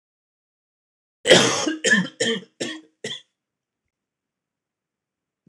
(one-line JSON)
{"cough_length": "5.5 s", "cough_amplitude": 26028, "cough_signal_mean_std_ratio": 0.32, "survey_phase": "alpha (2021-03-01 to 2021-08-12)", "age": "45-64", "gender": "Male", "wearing_mask": "No", "symptom_none": true, "smoker_status": "Never smoked", "respiratory_condition_asthma": false, "respiratory_condition_other": false, "recruitment_source": "REACT", "submission_delay": "2 days", "covid_test_result": "Negative", "covid_test_method": "RT-qPCR"}